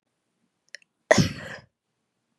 {"exhalation_length": "2.4 s", "exhalation_amplitude": 25407, "exhalation_signal_mean_std_ratio": 0.22, "survey_phase": "beta (2021-08-13 to 2022-03-07)", "age": "18-44", "gender": "Female", "wearing_mask": "No", "symptom_cough_any": true, "symptom_runny_or_blocked_nose": true, "symptom_shortness_of_breath": true, "symptom_sore_throat": true, "symptom_change_to_sense_of_smell_or_taste": true, "smoker_status": "Never smoked", "respiratory_condition_asthma": false, "respiratory_condition_other": false, "recruitment_source": "Test and Trace", "submission_delay": "1 day", "covid_test_result": "Positive", "covid_test_method": "LFT"}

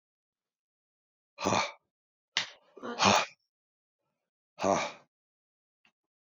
{"exhalation_length": "6.2 s", "exhalation_amplitude": 10643, "exhalation_signal_mean_std_ratio": 0.29, "survey_phase": "alpha (2021-03-01 to 2021-08-12)", "age": "65+", "gender": "Male", "wearing_mask": "No", "symptom_abdominal_pain": true, "symptom_diarrhoea": true, "symptom_headache": true, "symptom_onset": "3 days", "smoker_status": "Never smoked", "respiratory_condition_asthma": false, "respiratory_condition_other": false, "recruitment_source": "Test and Trace", "submission_delay": "1 day", "covid_test_result": "Positive", "covid_test_method": "RT-qPCR", "covid_ct_value": 22.2, "covid_ct_gene": "ORF1ab gene", "covid_ct_mean": 22.6, "covid_viral_load": "39000 copies/ml", "covid_viral_load_category": "Low viral load (10K-1M copies/ml)"}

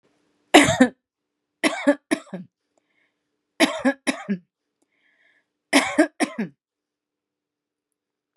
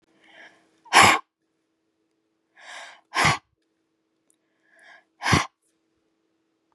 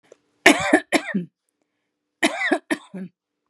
{"three_cough_length": "8.4 s", "three_cough_amplitude": 32767, "three_cough_signal_mean_std_ratio": 0.29, "exhalation_length": "6.7 s", "exhalation_amplitude": 27881, "exhalation_signal_mean_std_ratio": 0.24, "cough_length": "3.5 s", "cough_amplitude": 32768, "cough_signal_mean_std_ratio": 0.36, "survey_phase": "beta (2021-08-13 to 2022-03-07)", "age": "65+", "gender": "Female", "wearing_mask": "No", "symptom_cough_any": true, "symptom_sore_throat": true, "smoker_status": "Ex-smoker", "respiratory_condition_asthma": false, "respiratory_condition_other": false, "recruitment_source": "REACT", "submission_delay": "3 days", "covid_test_result": "Negative", "covid_test_method": "RT-qPCR", "influenza_a_test_result": "Unknown/Void", "influenza_b_test_result": "Unknown/Void"}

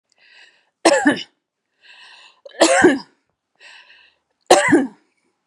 {"three_cough_length": "5.5 s", "three_cough_amplitude": 32768, "three_cough_signal_mean_std_ratio": 0.36, "survey_phase": "beta (2021-08-13 to 2022-03-07)", "age": "45-64", "gender": "Female", "wearing_mask": "No", "symptom_none": true, "smoker_status": "Never smoked", "respiratory_condition_asthma": false, "respiratory_condition_other": false, "recruitment_source": "REACT", "submission_delay": "1 day", "covid_test_result": "Negative", "covid_test_method": "RT-qPCR"}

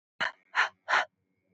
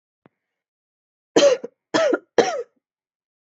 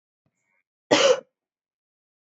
{"exhalation_length": "1.5 s", "exhalation_amplitude": 8014, "exhalation_signal_mean_std_ratio": 0.39, "three_cough_length": "3.6 s", "three_cough_amplitude": 27057, "three_cough_signal_mean_std_ratio": 0.34, "cough_length": "2.2 s", "cough_amplitude": 23118, "cough_signal_mean_std_ratio": 0.27, "survey_phase": "beta (2021-08-13 to 2022-03-07)", "age": "18-44", "gender": "Female", "wearing_mask": "Yes", "symptom_cough_any": true, "symptom_runny_or_blocked_nose": true, "symptom_loss_of_taste": true, "symptom_other": true, "symptom_onset": "3 days", "smoker_status": "Prefer not to say", "respiratory_condition_asthma": false, "respiratory_condition_other": false, "recruitment_source": "Test and Trace", "submission_delay": "1 day", "covid_test_result": "Positive", "covid_test_method": "RT-qPCR", "covid_ct_value": 22.5, "covid_ct_gene": "ORF1ab gene"}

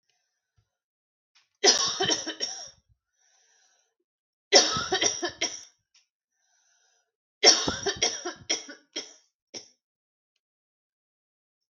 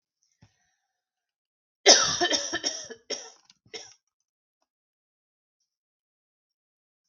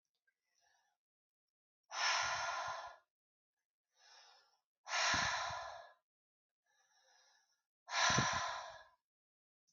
{"three_cough_length": "11.7 s", "three_cough_amplitude": 25667, "three_cough_signal_mean_std_ratio": 0.31, "cough_length": "7.1 s", "cough_amplitude": 30693, "cough_signal_mean_std_ratio": 0.23, "exhalation_length": "9.7 s", "exhalation_amplitude": 3476, "exhalation_signal_mean_std_ratio": 0.41, "survey_phase": "alpha (2021-03-01 to 2021-08-12)", "age": "18-44", "gender": "Female", "wearing_mask": "No", "symptom_none": true, "smoker_status": "Never smoked", "respiratory_condition_asthma": false, "respiratory_condition_other": false, "recruitment_source": "REACT", "submission_delay": "1 day", "covid_test_result": "Negative", "covid_test_method": "RT-qPCR"}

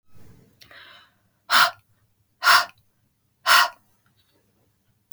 {"exhalation_length": "5.1 s", "exhalation_amplitude": 28539, "exhalation_signal_mean_std_ratio": 0.29, "survey_phase": "beta (2021-08-13 to 2022-03-07)", "age": "45-64", "gender": "Female", "wearing_mask": "No", "symptom_headache": true, "smoker_status": "Never smoked", "respiratory_condition_asthma": false, "respiratory_condition_other": false, "recruitment_source": "REACT", "submission_delay": "1 day", "covid_test_result": "Negative", "covid_test_method": "RT-qPCR", "influenza_a_test_result": "Negative", "influenza_b_test_result": "Negative"}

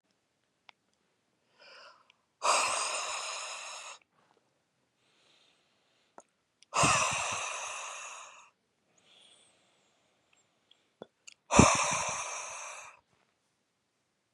{"exhalation_length": "14.3 s", "exhalation_amplitude": 16432, "exhalation_signal_mean_std_ratio": 0.34, "survey_phase": "beta (2021-08-13 to 2022-03-07)", "age": "18-44", "gender": "Male", "wearing_mask": "No", "symptom_fatigue": true, "symptom_headache": true, "symptom_other": true, "symptom_onset": "4 days", "smoker_status": "Never smoked", "respiratory_condition_asthma": false, "respiratory_condition_other": false, "recruitment_source": "Test and Trace", "submission_delay": "2 days", "covid_test_result": "Positive", "covid_test_method": "RT-qPCR", "covid_ct_value": 19.1, "covid_ct_gene": "ORF1ab gene", "covid_ct_mean": 19.5, "covid_viral_load": "410000 copies/ml", "covid_viral_load_category": "Low viral load (10K-1M copies/ml)"}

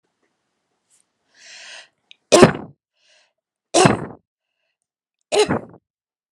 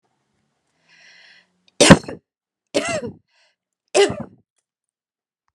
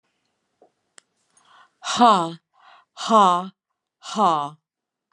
{"three_cough_length": "6.3 s", "three_cough_amplitude": 32768, "three_cough_signal_mean_std_ratio": 0.25, "cough_length": "5.5 s", "cough_amplitude": 32768, "cough_signal_mean_std_ratio": 0.23, "exhalation_length": "5.1 s", "exhalation_amplitude": 26485, "exhalation_signal_mean_std_ratio": 0.35, "survey_phase": "alpha (2021-03-01 to 2021-08-12)", "age": "45-64", "gender": "Female", "wearing_mask": "No", "symptom_headache": true, "symptom_onset": "12 days", "smoker_status": "Ex-smoker", "respiratory_condition_asthma": false, "respiratory_condition_other": false, "recruitment_source": "REACT", "submission_delay": "1 day", "covid_test_result": "Negative", "covid_test_method": "RT-qPCR"}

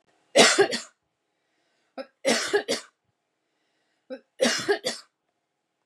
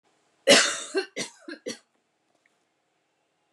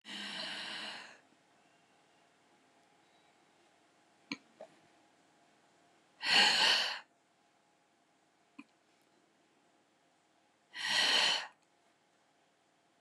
{"three_cough_length": "5.9 s", "three_cough_amplitude": 23976, "three_cough_signal_mean_std_ratio": 0.35, "cough_length": "3.5 s", "cough_amplitude": 22537, "cough_signal_mean_std_ratio": 0.28, "exhalation_length": "13.0 s", "exhalation_amplitude": 6708, "exhalation_signal_mean_std_ratio": 0.31, "survey_phase": "beta (2021-08-13 to 2022-03-07)", "age": "45-64", "gender": "Female", "wearing_mask": "No", "symptom_none": true, "smoker_status": "Ex-smoker", "respiratory_condition_asthma": false, "respiratory_condition_other": false, "recruitment_source": "REACT", "submission_delay": "7 days", "covid_test_result": "Negative", "covid_test_method": "RT-qPCR", "influenza_a_test_result": "Negative", "influenza_b_test_result": "Negative"}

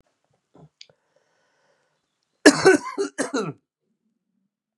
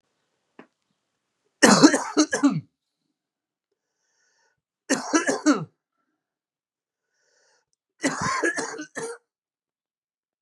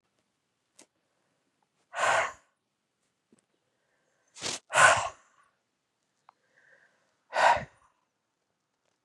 {"cough_length": "4.8 s", "cough_amplitude": 32768, "cough_signal_mean_std_ratio": 0.24, "three_cough_length": "10.4 s", "three_cough_amplitude": 31948, "three_cough_signal_mean_std_ratio": 0.3, "exhalation_length": "9.0 s", "exhalation_amplitude": 16676, "exhalation_signal_mean_std_ratio": 0.25, "survey_phase": "beta (2021-08-13 to 2022-03-07)", "age": "45-64", "gender": "Male", "wearing_mask": "No", "symptom_cough_any": true, "symptom_fatigue": true, "symptom_headache": true, "symptom_onset": "2 days", "smoker_status": "Ex-smoker", "respiratory_condition_asthma": false, "respiratory_condition_other": false, "recruitment_source": "Test and Trace", "submission_delay": "2 days", "covid_test_result": "Positive", "covid_test_method": "RT-qPCR"}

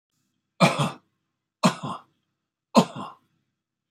{"three_cough_length": "3.9 s", "three_cough_amplitude": 24985, "three_cough_signal_mean_std_ratio": 0.28, "survey_phase": "beta (2021-08-13 to 2022-03-07)", "age": "65+", "gender": "Male", "wearing_mask": "No", "symptom_none": true, "symptom_onset": "12 days", "smoker_status": "Never smoked", "respiratory_condition_asthma": true, "respiratory_condition_other": false, "recruitment_source": "REACT", "submission_delay": "2 days", "covid_test_result": "Negative", "covid_test_method": "RT-qPCR", "influenza_a_test_result": "Negative", "influenza_b_test_result": "Negative"}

